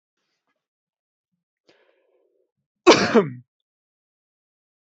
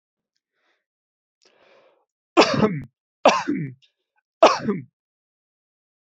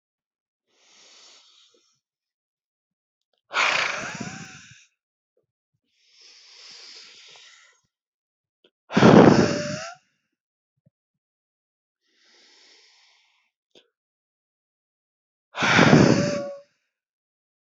cough_length: 4.9 s
cough_amplitude: 28442
cough_signal_mean_std_ratio: 0.19
three_cough_length: 6.1 s
three_cough_amplitude: 31691
three_cough_signal_mean_std_ratio: 0.28
exhalation_length: 17.7 s
exhalation_amplitude: 29874
exhalation_signal_mean_std_ratio: 0.25
survey_phase: beta (2021-08-13 to 2022-03-07)
age: 45-64
gender: Male
wearing_mask: 'No'
symptom_none: true
smoker_status: Never smoked
respiratory_condition_asthma: false
respiratory_condition_other: false
recruitment_source: REACT
submission_delay: 2 days
covid_test_result: Negative
covid_test_method: RT-qPCR
influenza_a_test_result: Negative
influenza_b_test_result: Negative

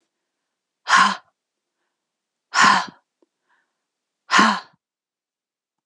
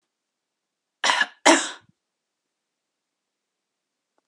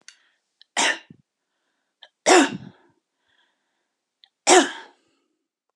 exhalation_length: 5.9 s
exhalation_amplitude: 27197
exhalation_signal_mean_std_ratio: 0.29
cough_length: 4.3 s
cough_amplitude: 29185
cough_signal_mean_std_ratio: 0.23
three_cough_length: 5.8 s
three_cough_amplitude: 30288
three_cough_signal_mean_std_ratio: 0.26
survey_phase: beta (2021-08-13 to 2022-03-07)
age: 45-64
gender: Female
wearing_mask: 'No'
symptom_none: true
smoker_status: Never smoked
respiratory_condition_asthma: false
respiratory_condition_other: false
recruitment_source: REACT
submission_delay: 2 days
covid_test_result: Negative
covid_test_method: RT-qPCR
influenza_a_test_result: Unknown/Void
influenza_b_test_result: Unknown/Void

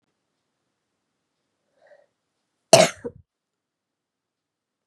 cough_length: 4.9 s
cough_amplitude: 32767
cough_signal_mean_std_ratio: 0.14
survey_phase: beta (2021-08-13 to 2022-03-07)
age: 45-64
gender: Female
wearing_mask: 'No'
symptom_cough_any: true
symptom_new_continuous_cough: true
symptom_runny_or_blocked_nose: true
symptom_sore_throat: true
symptom_fatigue: true
symptom_fever_high_temperature: true
symptom_change_to_sense_of_smell_or_taste: true
symptom_loss_of_taste: true
symptom_other: true
symptom_onset: 3 days
smoker_status: Never smoked
respiratory_condition_asthma: false
respiratory_condition_other: false
recruitment_source: Test and Trace
submission_delay: 1 day
covid_test_result: Positive
covid_test_method: LAMP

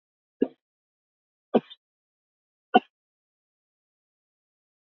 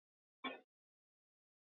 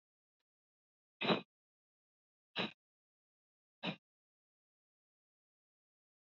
three_cough_length: 4.9 s
three_cough_amplitude: 18440
three_cough_signal_mean_std_ratio: 0.12
cough_length: 1.6 s
cough_amplitude: 902
cough_signal_mean_std_ratio: 0.21
exhalation_length: 6.4 s
exhalation_amplitude: 3386
exhalation_signal_mean_std_ratio: 0.18
survey_phase: beta (2021-08-13 to 2022-03-07)
age: 65+
gender: Male
wearing_mask: 'No'
symptom_none: true
smoker_status: Never smoked
respiratory_condition_asthma: false
respiratory_condition_other: false
recruitment_source: REACT
submission_delay: 2 days
covid_test_result: Negative
covid_test_method: RT-qPCR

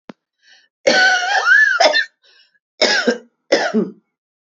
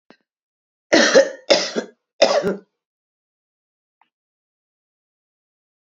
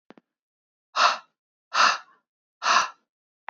cough_length: 4.5 s
cough_amplitude: 32767
cough_signal_mean_std_ratio: 0.55
three_cough_length: 5.8 s
three_cough_amplitude: 32030
three_cough_signal_mean_std_ratio: 0.29
exhalation_length: 3.5 s
exhalation_amplitude: 19177
exhalation_signal_mean_std_ratio: 0.34
survey_phase: beta (2021-08-13 to 2022-03-07)
age: 45-64
gender: Female
wearing_mask: 'No'
symptom_runny_or_blocked_nose: true
symptom_abdominal_pain: true
symptom_fatigue: true
symptom_fever_high_temperature: true
symptom_headache: true
smoker_status: Ex-smoker
respiratory_condition_asthma: true
respiratory_condition_other: false
recruitment_source: Test and Trace
submission_delay: 2 days
covid_test_result: Positive
covid_test_method: RT-qPCR
covid_ct_value: 22.4
covid_ct_gene: ORF1ab gene
covid_ct_mean: 23.5
covid_viral_load: 19000 copies/ml
covid_viral_load_category: Low viral load (10K-1M copies/ml)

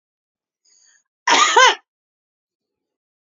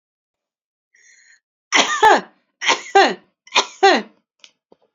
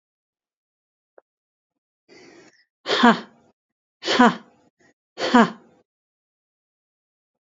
cough_length: 3.2 s
cough_amplitude: 29099
cough_signal_mean_std_ratio: 0.3
three_cough_length: 4.9 s
three_cough_amplitude: 30771
three_cough_signal_mean_std_ratio: 0.35
exhalation_length: 7.4 s
exhalation_amplitude: 29080
exhalation_signal_mean_std_ratio: 0.24
survey_phase: beta (2021-08-13 to 2022-03-07)
age: 45-64
gender: Female
wearing_mask: 'No'
symptom_none: true
symptom_onset: 12 days
smoker_status: Never smoked
respiratory_condition_asthma: true
respiratory_condition_other: false
recruitment_source: REACT
submission_delay: 2 days
covid_test_result: Negative
covid_test_method: RT-qPCR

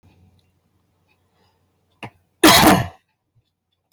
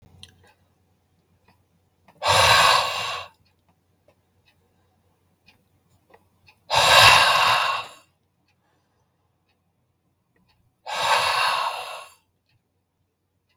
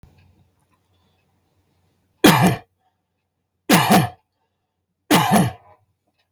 cough_length: 3.9 s
cough_amplitude: 32768
cough_signal_mean_std_ratio: 0.27
exhalation_length: 13.6 s
exhalation_amplitude: 31515
exhalation_signal_mean_std_ratio: 0.36
three_cough_length: 6.3 s
three_cough_amplitude: 32768
three_cough_signal_mean_std_ratio: 0.33
survey_phase: beta (2021-08-13 to 2022-03-07)
age: 45-64
gender: Male
wearing_mask: 'No'
symptom_none: true
smoker_status: Never smoked
respiratory_condition_asthma: true
respiratory_condition_other: false
recruitment_source: REACT
submission_delay: 1 day
covid_test_result: Negative
covid_test_method: RT-qPCR
influenza_a_test_result: Negative
influenza_b_test_result: Negative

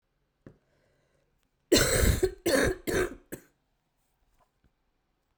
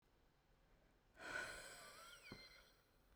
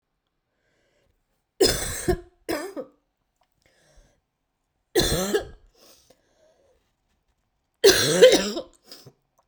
cough_length: 5.4 s
cough_amplitude: 11440
cough_signal_mean_std_ratio: 0.37
exhalation_length: 3.2 s
exhalation_amplitude: 554
exhalation_signal_mean_std_ratio: 0.57
three_cough_length: 9.5 s
three_cough_amplitude: 32768
three_cough_signal_mean_std_ratio: 0.31
survey_phase: beta (2021-08-13 to 2022-03-07)
age: 18-44
gender: Female
wearing_mask: 'No'
symptom_cough_any: true
symptom_new_continuous_cough: true
symptom_shortness_of_breath: true
symptom_sore_throat: true
symptom_abdominal_pain: true
symptom_fatigue: true
symptom_onset: 6 days
smoker_status: Ex-smoker
respiratory_condition_asthma: true
respiratory_condition_other: false
recruitment_source: Test and Trace
submission_delay: 2 days
covid_test_result: Positive
covid_test_method: RT-qPCR
covid_ct_value: 21.6
covid_ct_gene: N gene
covid_ct_mean: 21.7
covid_viral_load: 76000 copies/ml
covid_viral_load_category: Low viral load (10K-1M copies/ml)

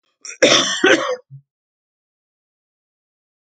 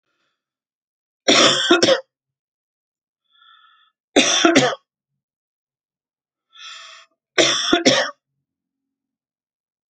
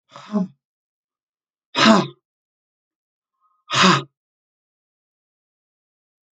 cough_length: 3.4 s
cough_amplitude: 32768
cough_signal_mean_std_ratio: 0.35
three_cough_length: 9.9 s
three_cough_amplitude: 32767
three_cough_signal_mean_std_ratio: 0.35
exhalation_length: 6.3 s
exhalation_amplitude: 28526
exhalation_signal_mean_std_ratio: 0.26
survey_phase: alpha (2021-03-01 to 2021-08-12)
age: 65+
gender: Female
wearing_mask: 'No'
symptom_none: true
smoker_status: Ex-smoker
respiratory_condition_asthma: false
respiratory_condition_other: false
recruitment_source: REACT
submission_delay: 4 days
covid_test_result: Negative
covid_test_method: RT-qPCR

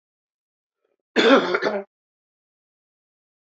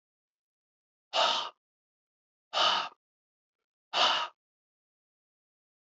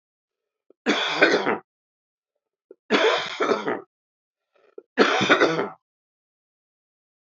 cough_length: 3.5 s
cough_amplitude: 25041
cough_signal_mean_std_ratio: 0.3
exhalation_length: 6.0 s
exhalation_amplitude: 8519
exhalation_signal_mean_std_ratio: 0.32
three_cough_length: 7.3 s
three_cough_amplitude: 23541
three_cough_signal_mean_std_ratio: 0.42
survey_phase: beta (2021-08-13 to 2022-03-07)
age: 45-64
gender: Male
wearing_mask: 'No'
symptom_runny_or_blocked_nose: true
symptom_headache: true
symptom_onset: 3 days
smoker_status: Never smoked
respiratory_condition_asthma: false
respiratory_condition_other: false
recruitment_source: Test and Trace
submission_delay: 2 days
covid_test_result: Positive
covid_test_method: RT-qPCR
covid_ct_value: 15.4
covid_ct_gene: ORF1ab gene
covid_ct_mean: 16.0
covid_viral_load: 5700000 copies/ml
covid_viral_load_category: High viral load (>1M copies/ml)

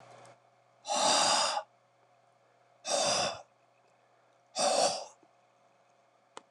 exhalation_length: 6.5 s
exhalation_amplitude: 6278
exhalation_signal_mean_std_ratio: 0.44
survey_phase: beta (2021-08-13 to 2022-03-07)
age: 65+
gender: Male
wearing_mask: 'No'
symptom_cough_any: true
symptom_runny_or_blocked_nose: true
symptom_headache: true
symptom_change_to_sense_of_smell_or_taste: true
smoker_status: Never smoked
respiratory_condition_asthma: false
respiratory_condition_other: false
recruitment_source: Test and Trace
submission_delay: 2 days
covid_test_result: Positive
covid_test_method: RT-qPCR
covid_ct_value: 29.5
covid_ct_gene: ORF1ab gene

